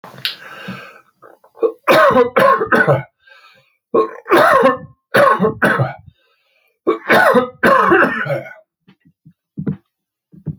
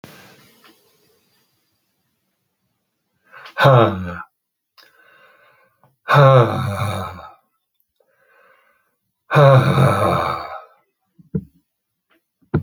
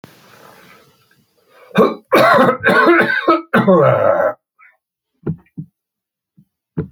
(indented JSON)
{
  "three_cough_length": "10.6 s",
  "three_cough_amplitude": 32767,
  "three_cough_signal_mean_std_ratio": 0.53,
  "exhalation_length": "12.6 s",
  "exhalation_amplitude": 29956,
  "exhalation_signal_mean_std_ratio": 0.35,
  "cough_length": "6.9 s",
  "cough_amplitude": 29982,
  "cough_signal_mean_std_ratio": 0.5,
  "survey_phase": "alpha (2021-03-01 to 2021-08-12)",
  "age": "65+",
  "gender": "Male",
  "wearing_mask": "No",
  "symptom_none": true,
  "smoker_status": "Never smoked",
  "respiratory_condition_asthma": false,
  "respiratory_condition_other": false,
  "recruitment_source": "REACT",
  "submission_delay": "1 day",
  "covid_test_result": "Negative",
  "covid_test_method": "RT-qPCR"
}